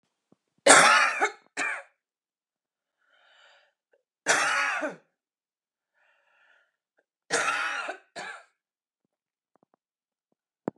{"three_cough_length": "10.8 s", "three_cough_amplitude": 29163, "three_cough_signal_mean_std_ratio": 0.3, "survey_phase": "beta (2021-08-13 to 2022-03-07)", "age": "18-44", "gender": "Female", "wearing_mask": "No", "symptom_shortness_of_breath": true, "symptom_fatigue": true, "symptom_headache": true, "symptom_onset": "7 days", "smoker_status": "Current smoker (1 to 10 cigarettes per day)", "respiratory_condition_asthma": true, "respiratory_condition_other": false, "recruitment_source": "REACT", "submission_delay": "1 day", "covid_test_result": "Negative", "covid_test_method": "RT-qPCR", "influenza_a_test_result": "Negative", "influenza_b_test_result": "Negative"}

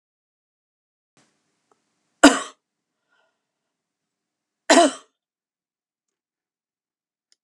{"cough_length": "7.4 s", "cough_amplitude": 32768, "cough_signal_mean_std_ratio": 0.16, "survey_phase": "alpha (2021-03-01 to 2021-08-12)", "age": "65+", "gender": "Female", "wearing_mask": "No", "symptom_fatigue": true, "smoker_status": "Never smoked", "respiratory_condition_asthma": false, "respiratory_condition_other": false, "recruitment_source": "REACT", "submission_delay": "2 days", "covid_test_result": "Negative", "covid_test_method": "RT-qPCR"}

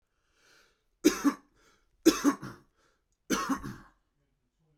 {"three_cough_length": "4.8 s", "three_cough_amplitude": 13340, "three_cough_signal_mean_std_ratio": 0.29, "survey_phase": "beta (2021-08-13 to 2022-03-07)", "age": "18-44", "gender": "Male", "wearing_mask": "No", "symptom_runny_or_blocked_nose": true, "symptom_onset": "8 days", "smoker_status": "Current smoker (11 or more cigarettes per day)", "respiratory_condition_asthma": true, "respiratory_condition_other": false, "recruitment_source": "REACT", "submission_delay": "0 days", "covid_test_result": "Negative", "covid_test_method": "RT-qPCR"}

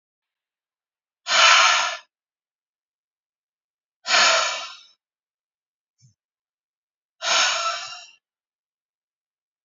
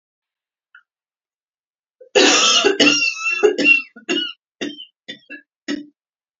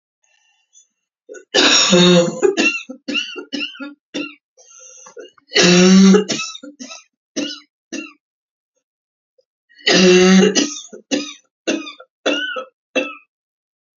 {"exhalation_length": "9.6 s", "exhalation_amplitude": 25986, "exhalation_signal_mean_std_ratio": 0.33, "cough_length": "6.4 s", "cough_amplitude": 31368, "cough_signal_mean_std_ratio": 0.45, "three_cough_length": "14.0 s", "three_cough_amplitude": 32368, "three_cough_signal_mean_std_ratio": 0.45, "survey_phase": "beta (2021-08-13 to 2022-03-07)", "age": "45-64", "gender": "Female", "wearing_mask": "No", "symptom_cough_any": true, "symptom_fatigue": true, "symptom_headache": true, "symptom_onset": "12 days", "smoker_status": "Never smoked", "respiratory_condition_asthma": false, "respiratory_condition_other": false, "recruitment_source": "REACT", "submission_delay": "3 days", "covid_test_result": "Negative", "covid_test_method": "RT-qPCR"}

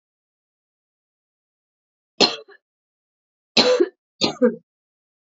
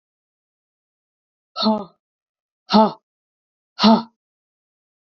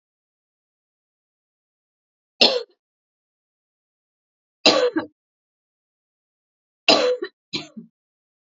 {"cough_length": "5.3 s", "cough_amplitude": 29811, "cough_signal_mean_std_ratio": 0.27, "exhalation_length": "5.1 s", "exhalation_amplitude": 28757, "exhalation_signal_mean_std_ratio": 0.25, "three_cough_length": "8.5 s", "three_cough_amplitude": 32767, "three_cough_signal_mean_std_ratio": 0.24, "survey_phase": "beta (2021-08-13 to 2022-03-07)", "age": "18-44", "gender": "Female", "wearing_mask": "No", "symptom_cough_any": true, "symptom_runny_or_blocked_nose": true, "symptom_sore_throat": true, "symptom_change_to_sense_of_smell_or_taste": true, "symptom_loss_of_taste": true, "symptom_other": true, "symptom_onset": "4 days", "smoker_status": "Never smoked", "respiratory_condition_asthma": false, "respiratory_condition_other": false, "recruitment_source": "Test and Trace", "submission_delay": "2 days", "covid_test_result": "Positive", "covid_test_method": "RT-qPCR", "covid_ct_value": 17.6, "covid_ct_gene": "ORF1ab gene"}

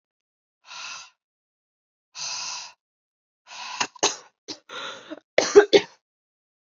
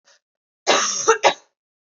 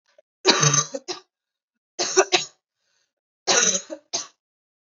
{"exhalation_length": "6.7 s", "exhalation_amplitude": 28022, "exhalation_signal_mean_std_ratio": 0.24, "cough_length": "2.0 s", "cough_amplitude": 27833, "cough_signal_mean_std_ratio": 0.4, "three_cough_length": "4.9 s", "three_cough_amplitude": 26285, "three_cough_signal_mean_std_ratio": 0.38, "survey_phase": "beta (2021-08-13 to 2022-03-07)", "age": "18-44", "gender": "Female", "wearing_mask": "No", "symptom_cough_any": true, "symptom_runny_or_blocked_nose": true, "symptom_fatigue": true, "symptom_onset": "5 days", "smoker_status": "Never smoked", "respiratory_condition_asthma": false, "respiratory_condition_other": false, "recruitment_source": "Test and Trace", "submission_delay": "2 days", "covid_test_result": "Positive", "covid_test_method": "RT-qPCR", "covid_ct_value": 28.9, "covid_ct_gene": "ORF1ab gene"}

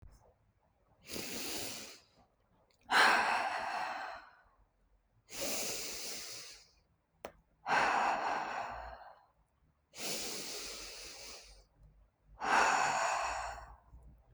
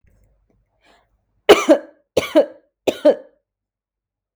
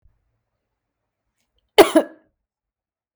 {"exhalation_length": "14.3 s", "exhalation_amplitude": 6331, "exhalation_signal_mean_std_ratio": 0.52, "three_cough_length": "4.4 s", "three_cough_amplitude": 32768, "three_cough_signal_mean_std_ratio": 0.27, "cough_length": "3.2 s", "cough_amplitude": 32768, "cough_signal_mean_std_ratio": 0.17, "survey_phase": "beta (2021-08-13 to 2022-03-07)", "age": "18-44", "gender": "Female", "wearing_mask": "No", "symptom_none": true, "smoker_status": "Never smoked", "respiratory_condition_asthma": false, "respiratory_condition_other": false, "recruitment_source": "REACT", "submission_delay": "4 days", "covid_test_result": "Negative", "covid_test_method": "RT-qPCR"}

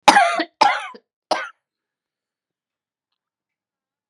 {"cough_length": "4.1 s", "cough_amplitude": 32768, "cough_signal_mean_std_ratio": 0.28, "survey_phase": "beta (2021-08-13 to 2022-03-07)", "age": "45-64", "gender": "Female", "wearing_mask": "Yes", "symptom_cough_any": true, "symptom_shortness_of_breath": true, "symptom_sore_throat": true, "symptom_abdominal_pain": true, "symptom_fatigue": true, "smoker_status": "Never smoked", "respiratory_condition_asthma": true, "respiratory_condition_other": false, "recruitment_source": "Test and Trace", "submission_delay": "1 day", "covid_test_result": "Positive", "covid_test_method": "RT-qPCR", "covid_ct_value": 22.7, "covid_ct_gene": "ORF1ab gene", "covid_ct_mean": 22.9, "covid_viral_load": "30000 copies/ml", "covid_viral_load_category": "Low viral load (10K-1M copies/ml)"}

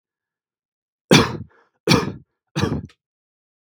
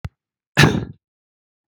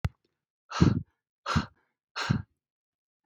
{"three_cough_length": "3.7 s", "three_cough_amplitude": 32768, "three_cough_signal_mean_std_ratio": 0.3, "cough_length": "1.7 s", "cough_amplitude": 32768, "cough_signal_mean_std_ratio": 0.29, "exhalation_length": "3.3 s", "exhalation_amplitude": 15898, "exhalation_signal_mean_std_ratio": 0.32, "survey_phase": "beta (2021-08-13 to 2022-03-07)", "age": "18-44", "gender": "Male", "wearing_mask": "No", "symptom_none": true, "smoker_status": "Never smoked", "respiratory_condition_asthma": false, "respiratory_condition_other": false, "recruitment_source": "REACT", "submission_delay": "0 days", "covid_test_result": "Negative", "covid_test_method": "RT-qPCR"}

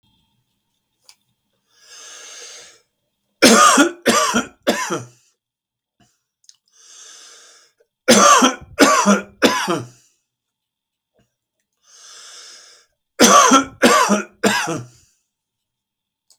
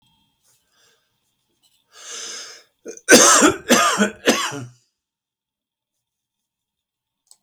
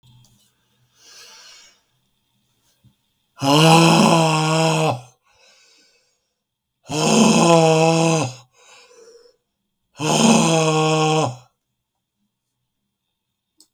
{"three_cough_length": "16.4 s", "three_cough_amplitude": 32768, "three_cough_signal_mean_std_ratio": 0.37, "cough_length": "7.4 s", "cough_amplitude": 32768, "cough_signal_mean_std_ratio": 0.31, "exhalation_length": "13.7 s", "exhalation_amplitude": 32766, "exhalation_signal_mean_std_ratio": 0.46, "survey_phase": "beta (2021-08-13 to 2022-03-07)", "age": "65+", "gender": "Male", "wearing_mask": "No", "symptom_sore_throat": true, "smoker_status": "Ex-smoker", "respiratory_condition_asthma": false, "respiratory_condition_other": false, "recruitment_source": "REACT", "submission_delay": "2 days", "covid_test_result": "Negative", "covid_test_method": "RT-qPCR", "influenza_a_test_result": "Negative", "influenza_b_test_result": "Negative"}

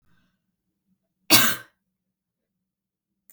{"cough_length": "3.3 s", "cough_amplitude": 32766, "cough_signal_mean_std_ratio": 0.21, "survey_phase": "beta (2021-08-13 to 2022-03-07)", "age": "18-44", "gender": "Female", "wearing_mask": "No", "symptom_cough_any": true, "symptom_runny_or_blocked_nose": true, "symptom_sore_throat": true, "symptom_fever_high_temperature": true, "symptom_headache": true, "smoker_status": "Ex-smoker", "respiratory_condition_asthma": false, "respiratory_condition_other": false, "recruitment_source": "Test and Trace", "submission_delay": "2 days", "covid_test_result": "Positive", "covid_test_method": "RT-qPCR", "covid_ct_value": 21.6, "covid_ct_gene": "ORF1ab gene", "covid_ct_mean": 22.0, "covid_viral_load": "63000 copies/ml", "covid_viral_load_category": "Low viral load (10K-1M copies/ml)"}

